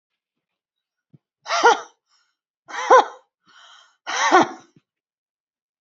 {"exhalation_length": "5.8 s", "exhalation_amplitude": 32678, "exhalation_signal_mean_std_ratio": 0.28, "survey_phase": "beta (2021-08-13 to 2022-03-07)", "age": "45-64", "gender": "Female", "wearing_mask": "No", "symptom_none": true, "smoker_status": "Never smoked", "respiratory_condition_asthma": true, "respiratory_condition_other": false, "recruitment_source": "REACT", "submission_delay": "1 day", "covid_test_result": "Negative", "covid_test_method": "RT-qPCR"}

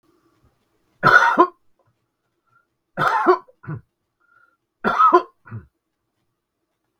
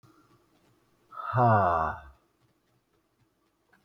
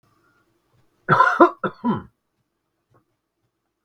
{"three_cough_length": "7.0 s", "three_cough_amplitude": 32768, "three_cough_signal_mean_std_ratio": 0.32, "exhalation_length": "3.8 s", "exhalation_amplitude": 9376, "exhalation_signal_mean_std_ratio": 0.36, "cough_length": "3.8 s", "cough_amplitude": 32768, "cough_signal_mean_std_ratio": 0.28, "survey_phase": "beta (2021-08-13 to 2022-03-07)", "age": "65+", "gender": "Male", "wearing_mask": "No", "symptom_none": true, "smoker_status": "Never smoked", "respiratory_condition_asthma": false, "respiratory_condition_other": false, "recruitment_source": "REACT", "submission_delay": "2 days", "covid_test_result": "Negative", "covid_test_method": "RT-qPCR", "influenza_a_test_result": "Negative", "influenza_b_test_result": "Negative"}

